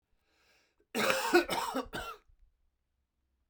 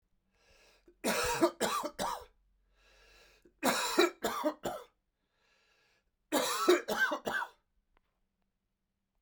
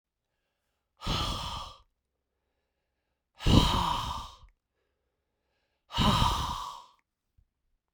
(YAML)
cough_length: 3.5 s
cough_amplitude: 11123
cough_signal_mean_std_ratio: 0.39
three_cough_length: 9.2 s
three_cough_amplitude: 7137
three_cough_signal_mean_std_ratio: 0.43
exhalation_length: 7.9 s
exhalation_amplitude: 15251
exhalation_signal_mean_std_ratio: 0.38
survey_phase: beta (2021-08-13 to 2022-03-07)
age: 45-64
gender: Male
wearing_mask: 'No'
symptom_cough_any: true
symptom_runny_or_blocked_nose: true
symptom_change_to_sense_of_smell_or_taste: true
symptom_loss_of_taste: true
symptom_onset: 3 days
smoker_status: Never smoked
respiratory_condition_asthma: false
respiratory_condition_other: false
recruitment_source: Test and Trace
submission_delay: 1 day
covid_test_result: Positive
covid_test_method: RT-qPCR
covid_ct_value: 16.6
covid_ct_gene: ORF1ab gene
covid_ct_mean: 17.5
covid_viral_load: 1800000 copies/ml
covid_viral_load_category: High viral load (>1M copies/ml)